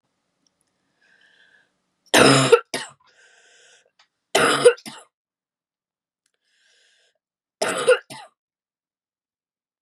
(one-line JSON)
{"three_cough_length": "9.8 s", "three_cough_amplitude": 30427, "three_cough_signal_mean_std_ratio": 0.26, "survey_phase": "beta (2021-08-13 to 2022-03-07)", "age": "18-44", "gender": "Female", "wearing_mask": "No", "symptom_runny_or_blocked_nose": true, "symptom_sore_throat": true, "symptom_headache": true, "symptom_onset": "1 day", "smoker_status": "Never smoked", "respiratory_condition_asthma": false, "respiratory_condition_other": false, "recruitment_source": "Test and Trace", "submission_delay": "1 day", "covid_test_result": "Positive", "covid_test_method": "RT-qPCR", "covid_ct_value": 30.7, "covid_ct_gene": "N gene"}